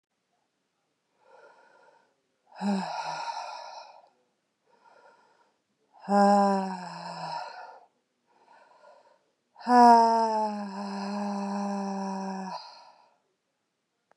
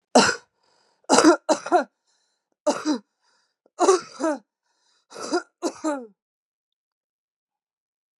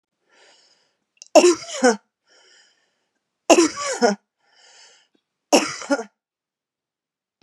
exhalation_length: 14.2 s
exhalation_amplitude: 14800
exhalation_signal_mean_std_ratio: 0.39
cough_length: 8.2 s
cough_amplitude: 30026
cough_signal_mean_std_ratio: 0.33
three_cough_length: 7.4 s
three_cough_amplitude: 32767
three_cough_signal_mean_std_ratio: 0.29
survey_phase: beta (2021-08-13 to 2022-03-07)
age: 45-64
gender: Female
wearing_mask: 'No'
symptom_cough_any: true
symptom_runny_or_blocked_nose: true
symptom_abdominal_pain: true
symptom_fatigue: true
symptom_headache: true
symptom_change_to_sense_of_smell_or_taste: true
symptom_loss_of_taste: true
symptom_onset: 2 days
smoker_status: Current smoker (1 to 10 cigarettes per day)
respiratory_condition_asthma: false
respiratory_condition_other: false
recruitment_source: Test and Trace
submission_delay: 2 days
covid_test_result: Positive
covid_test_method: RT-qPCR
covid_ct_value: 18.9
covid_ct_gene: N gene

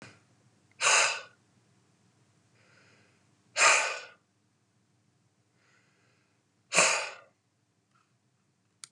exhalation_length: 8.9 s
exhalation_amplitude: 16346
exhalation_signal_mean_std_ratio: 0.28
survey_phase: beta (2021-08-13 to 2022-03-07)
age: 45-64
gender: Male
wearing_mask: 'No'
symptom_none: true
smoker_status: Ex-smoker
respiratory_condition_asthma: false
respiratory_condition_other: false
recruitment_source: REACT
submission_delay: 0 days
covid_test_result: Negative
covid_test_method: RT-qPCR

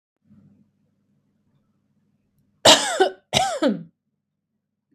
cough_length: 4.9 s
cough_amplitude: 32768
cough_signal_mean_std_ratio: 0.28
survey_phase: beta (2021-08-13 to 2022-03-07)
age: 45-64
gender: Female
wearing_mask: 'No'
symptom_none: true
smoker_status: Ex-smoker
respiratory_condition_asthma: false
respiratory_condition_other: false
recruitment_source: REACT
submission_delay: 6 days
covid_test_result: Negative
covid_test_method: RT-qPCR
influenza_a_test_result: Negative
influenza_b_test_result: Negative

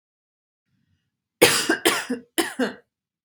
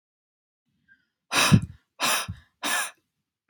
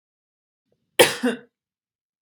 three_cough_length: 3.2 s
three_cough_amplitude: 32767
three_cough_signal_mean_std_ratio: 0.36
exhalation_length: 3.5 s
exhalation_amplitude: 20434
exhalation_signal_mean_std_ratio: 0.35
cough_length: 2.2 s
cough_amplitude: 32768
cough_signal_mean_std_ratio: 0.23
survey_phase: beta (2021-08-13 to 2022-03-07)
age: 18-44
gender: Female
wearing_mask: 'No'
symptom_none: true
smoker_status: Never smoked
respiratory_condition_asthma: false
respiratory_condition_other: false
recruitment_source: REACT
submission_delay: 3 days
covid_test_result: Negative
covid_test_method: RT-qPCR
influenza_a_test_result: Negative
influenza_b_test_result: Negative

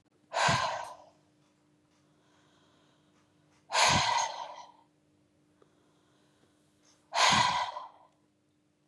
exhalation_length: 8.9 s
exhalation_amplitude: 8703
exhalation_signal_mean_std_ratio: 0.37
survey_phase: beta (2021-08-13 to 2022-03-07)
age: 18-44
gender: Female
wearing_mask: 'No'
symptom_none: true
smoker_status: Never smoked
respiratory_condition_asthma: false
respiratory_condition_other: false
recruitment_source: REACT
submission_delay: 6 days
covid_test_result: Negative
covid_test_method: RT-qPCR
influenza_a_test_result: Unknown/Void
influenza_b_test_result: Unknown/Void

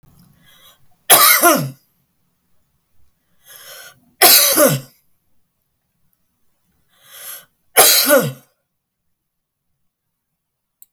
three_cough_length: 10.9 s
three_cough_amplitude: 32768
three_cough_signal_mean_std_ratio: 0.32
survey_phase: beta (2021-08-13 to 2022-03-07)
age: 45-64
gender: Female
wearing_mask: 'No'
symptom_none: true
smoker_status: Ex-smoker
respiratory_condition_asthma: false
respiratory_condition_other: false
recruitment_source: REACT
submission_delay: 1 day
covid_test_result: Negative
covid_test_method: RT-qPCR
influenza_a_test_result: Negative
influenza_b_test_result: Negative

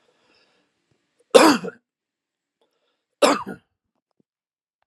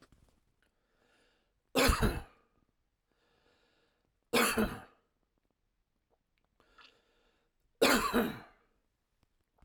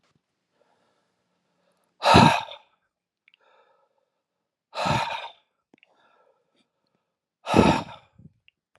cough_length: 4.9 s
cough_amplitude: 32768
cough_signal_mean_std_ratio: 0.22
three_cough_length: 9.6 s
three_cough_amplitude: 6788
three_cough_signal_mean_std_ratio: 0.3
exhalation_length: 8.8 s
exhalation_amplitude: 27683
exhalation_signal_mean_std_ratio: 0.26
survey_phase: alpha (2021-03-01 to 2021-08-12)
age: 65+
gender: Male
wearing_mask: 'No'
symptom_none: true
smoker_status: Ex-smoker
respiratory_condition_asthma: false
respiratory_condition_other: false
recruitment_source: REACT
submission_delay: 2 days
covid_test_result: Negative
covid_test_method: RT-qPCR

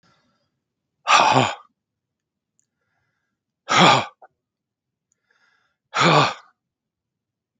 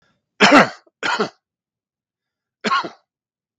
exhalation_length: 7.6 s
exhalation_amplitude: 32307
exhalation_signal_mean_std_ratio: 0.31
cough_length: 3.6 s
cough_amplitude: 32768
cough_signal_mean_std_ratio: 0.31
survey_phase: beta (2021-08-13 to 2022-03-07)
age: 65+
gender: Male
wearing_mask: 'No'
symptom_cough_any: true
smoker_status: Never smoked
respiratory_condition_asthma: false
respiratory_condition_other: false
recruitment_source: REACT
submission_delay: 1 day
covid_test_result: Negative
covid_test_method: RT-qPCR
influenza_a_test_result: Unknown/Void
influenza_b_test_result: Unknown/Void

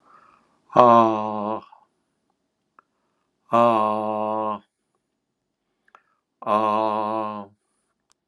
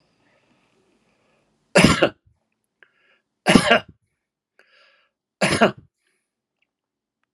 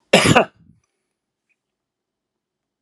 exhalation_length: 8.3 s
exhalation_amplitude: 32768
exhalation_signal_mean_std_ratio: 0.4
three_cough_length: 7.3 s
three_cough_amplitude: 32768
three_cough_signal_mean_std_ratio: 0.25
cough_length: 2.8 s
cough_amplitude: 32767
cough_signal_mean_std_ratio: 0.25
survey_phase: beta (2021-08-13 to 2022-03-07)
age: 65+
gender: Male
wearing_mask: 'No'
symptom_none: true
smoker_status: Ex-smoker
respiratory_condition_asthma: false
respiratory_condition_other: false
recruitment_source: REACT
submission_delay: 1 day
covid_test_result: Negative
covid_test_method: RT-qPCR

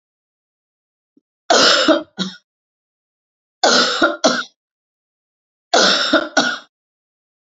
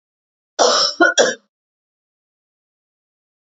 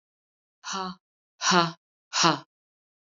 three_cough_length: 7.6 s
three_cough_amplitude: 32767
three_cough_signal_mean_std_ratio: 0.41
cough_length: 3.4 s
cough_amplitude: 31361
cough_signal_mean_std_ratio: 0.34
exhalation_length: 3.1 s
exhalation_amplitude: 19082
exhalation_signal_mean_std_ratio: 0.34
survey_phase: beta (2021-08-13 to 2022-03-07)
age: 45-64
gender: Female
wearing_mask: 'No'
symptom_cough_any: true
symptom_runny_or_blocked_nose: true
symptom_sore_throat: true
symptom_onset: 3 days
smoker_status: Never smoked
respiratory_condition_asthma: false
respiratory_condition_other: false
recruitment_source: Test and Trace
submission_delay: 1 day
covid_test_result: Positive
covid_test_method: RT-qPCR
covid_ct_value: 21.9
covid_ct_gene: N gene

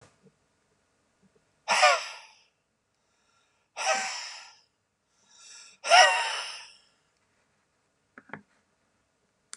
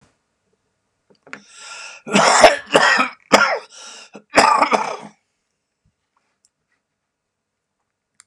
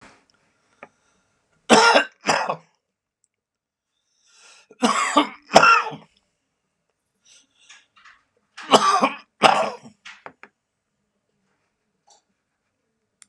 exhalation_length: 9.6 s
exhalation_amplitude: 18884
exhalation_signal_mean_std_ratio: 0.27
cough_length: 8.3 s
cough_amplitude: 32768
cough_signal_mean_std_ratio: 0.35
three_cough_length: 13.3 s
three_cough_amplitude: 32768
three_cough_signal_mean_std_ratio: 0.29
survey_phase: beta (2021-08-13 to 2022-03-07)
age: 65+
gender: Male
wearing_mask: 'No'
symptom_cough_any: true
smoker_status: Ex-smoker
respiratory_condition_asthma: false
respiratory_condition_other: false
recruitment_source: REACT
submission_delay: 3 days
covid_test_result: Negative
covid_test_method: RT-qPCR
influenza_a_test_result: Negative
influenza_b_test_result: Negative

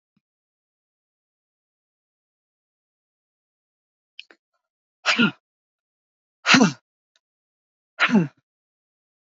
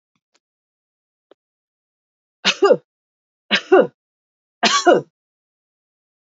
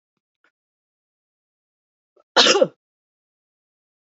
exhalation_length: 9.3 s
exhalation_amplitude: 27356
exhalation_signal_mean_std_ratio: 0.21
three_cough_length: 6.2 s
three_cough_amplitude: 29787
three_cough_signal_mean_std_ratio: 0.27
cough_length: 4.1 s
cough_amplitude: 30071
cough_signal_mean_std_ratio: 0.21
survey_phase: beta (2021-08-13 to 2022-03-07)
age: 45-64
gender: Female
wearing_mask: 'No'
symptom_none: true
smoker_status: Ex-smoker
respiratory_condition_asthma: false
respiratory_condition_other: false
recruitment_source: REACT
submission_delay: 2 days
covid_test_result: Negative
covid_test_method: RT-qPCR
influenza_a_test_result: Negative
influenza_b_test_result: Negative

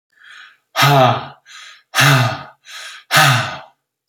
exhalation_length: 4.1 s
exhalation_amplitude: 31611
exhalation_signal_mean_std_ratio: 0.5
survey_phase: beta (2021-08-13 to 2022-03-07)
age: 45-64
gender: Male
wearing_mask: 'No'
symptom_none: true
smoker_status: Ex-smoker
respiratory_condition_asthma: false
respiratory_condition_other: false
recruitment_source: REACT
submission_delay: 2 days
covid_test_result: Negative
covid_test_method: RT-qPCR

